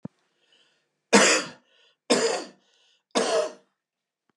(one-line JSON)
{"three_cough_length": "4.4 s", "three_cough_amplitude": 24174, "three_cough_signal_mean_std_ratio": 0.36, "survey_phase": "beta (2021-08-13 to 2022-03-07)", "age": "45-64", "gender": "Male", "wearing_mask": "No", "symptom_cough_any": true, "symptom_onset": "3 days", "smoker_status": "Ex-smoker", "respiratory_condition_asthma": false, "respiratory_condition_other": false, "recruitment_source": "Test and Trace", "submission_delay": "2 days", "covid_test_result": "Positive", "covid_test_method": "RT-qPCR"}